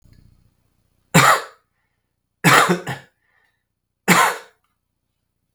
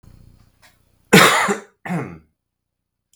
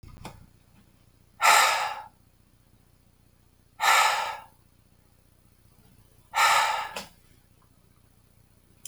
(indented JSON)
{
  "three_cough_length": "5.5 s",
  "three_cough_amplitude": 32768,
  "three_cough_signal_mean_std_ratio": 0.32,
  "cough_length": "3.2 s",
  "cough_amplitude": 32768,
  "cough_signal_mean_std_ratio": 0.32,
  "exhalation_length": "8.9 s",
  "exhalation_amplitude": 19303,
  "exhalation_signal_mean_std_ratio": 0.35,
  "survey_phase": "beta (2021-08-13 to 2022-03-07)",
  "age": "18-44",
  "gender": "Male",
  "wearing_mask": "No",
  "symptom_cough_any": true,
  "symptom_headache": true,
  "symptom_onset": "7 days",
  "smoker_status": "Ex-smoker",
  "respiratory_condition_asthma": false,
  "respiratory_condition_other": false,
  "recruitment_source": "REACT",
  "submission_delay": "11 days",
  "covid_test_result": "Negative",
  "covid_test_method": "RT-qPCR",
  "influenza_a_test_result": "Negative",
  "influenza_b_test_result": "Negative"
}